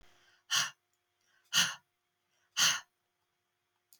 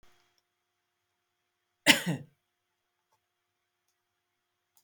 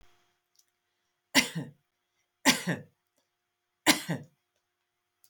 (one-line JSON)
{"exhalation_length": "4.0 s", "exhalation_amplitude": 6621, "exhalation_signal_mean_std_ratio": 0.3, "cough_length": "4.8 s", "cough_amplitude": 18235, "cough_signal_mean_std_ratio": 0.15, "three_cough_length": "5.3 s", "three_cough_amplitude": 16672, "three_cough_signal_mean_std_ratio": 0.25, "survey_phase": "beta (2021-08-13 to 2022-03-07)", "age": "65+", "gender": "Female", "wearing_mask": "No", "symptom_none": true, "smoker_status": "Never smoked", "respiratory_condition_asthma": false, "respiratory_condition_other": false, "recruitment_source": "REACT", "submission_delay": "1 day", "covid_test_result": "Negative", "covid_test_method": "RT-qPCR"}